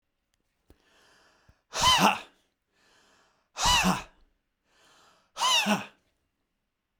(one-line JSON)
{"exhalation_length": "7.0 s", "exhalation_amplitude": 13729, "exhalation_signal_mean_std_ratio": 0.34, "survey_phase": "beta (2021-08-13 to 2022-03-07)", "age": "45-64", "gender": "Male", "wearing_mask": "No", "symptom_none": true, "smoker_status": "Never smoked", "respiratory_condition_asthma": true, "respiratory_condition_other": false, "recruitment_source": "Test and Trace", "submission_delay": "0 days", "covid_test_result": "Negative", "covid_test_method": "LFT"}